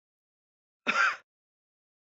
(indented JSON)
{
  "cough_length": "2.0 s",
  "cough_amplitude": 8125,
  "cough_signal_mean_std_ratio": 0.29,
  "survey_phase": "beta (2021-08-13 to 2022-03-07)",
  "age": "18-44",
  "gender": "Female",
  "wearing_mask": "No",
  "symptom_cough_any": true,
  "symptom_onset": "2 days",
  "smoker_status": "Never smoked",
  "respiratory_condition_asthma": false,
  "respiratory_condition_other": false,
  "recruitment_source": "REACT",
  "submission_delay": "2 days",
  "covid_test_result": "Negative",
  "covid_test_method": "RT-qPCR"
}